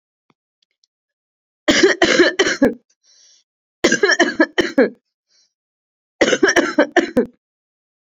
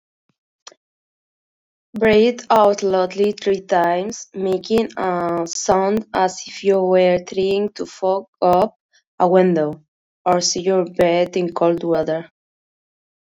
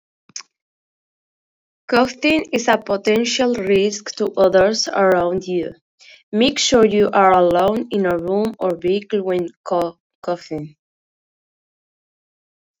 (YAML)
three_cough_length: 8.1 s
three_cough_amplitude: 32767
three_cough_signal_mean_std_ratio: 0.42
exhalation_length: 13.2 s
exhalation_amplitude: 26617
exhalation_signal_mean_std_ratio: 0.63
cough_length: 12.8 s
cough_amplitude: 28009
cough_signal_mean_std_ratio: 0.6
survey_phase: beta (2021-08-13 to 2022-03-07)
age: 18-44
wearing_mask: 'Yes'
symptom_none: true
symptom_onset: 4 days
smoker_status: Never smoked
respiratory_condition_asthma: false
respiratory_condition_other: false
recruitment_source: Test and Trace
submission_delay: 2 days
covid_test_result: Positive
covid_test_method: RT-qPCR
covid_ct_value: 19.0
covid_ct_gene: N gene
covid_ct_mean: 19.0
covid_viral_load: 580000 copies/ml
covid_viral_load_category: Low viral load (10K-1M copies/ml)